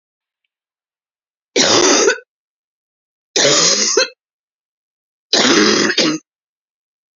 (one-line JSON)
{"three_cough_length": "7.2 s", "three_cough_amplitude": 32767, "three_cough_signal_mean_std_ratio": 0.46, "survey_phase": "beta (2021-08-13 to 2022-03-07)", "age": "45-64", "gender": "Female", "wearing_mask": "No", "symptom_cough_any": true, "symptom_shortness_of_breath": true, "symptom_fatigue": true, "symptom_headache": true, "symptom_change_to_sense_of_smell_or_taste": true, "symptom_loss_of_taste": true, "symptom_onset": "5 days", "smoker_status": "Never smoked", "respiratory_condition_asthma": false, "respiratory_condition_other": false, "recruitment_source": "Test and Trace", "submission_delay": "1 day", "covid_test_result": "Positive", "covid_test_method": "RT-qPCR", "covid_ct_value": 17.8, "covid_ct_gene": "ORF1ab gene", "covid_ct_mean": 18.2, "covid_viral_load": "1000000 copies/ml", "covid_viral_load_category": "High viral load (>1M copies/ml)"}